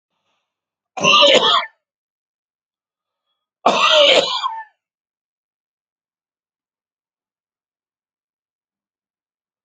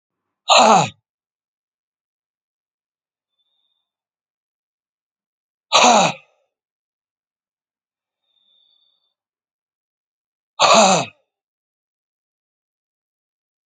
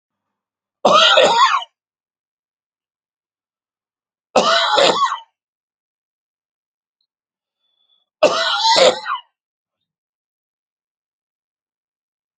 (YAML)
cough_length: 9.6 s
cough_amplitude: 32005
cough_signal_mean_std_ratio: 0.31
exhalation_length: 13.7 s
exhalation_amplitude: 30523
exhalation_signal_mean_std_ratio: 0.24
three_cough_length: 12.4 s
three_cough_amplitude: 32768
three_cough_signal_mean_std_ratio: 0.35
survey_phase: alpha (2021-03-01 to 2021-08-12)
age: 45-64
gender: Male
wearing_mask: 'No'
symptom_none: true
symptom_onset: 7 days
smoker_status: Never smoked
respiratory_condition_asthma: false
respiratory_condition_other: false
recruitment_source: REACT
submission_delay: 3 days
covid_test_result: Negative
covid_test_method: RT-qPCR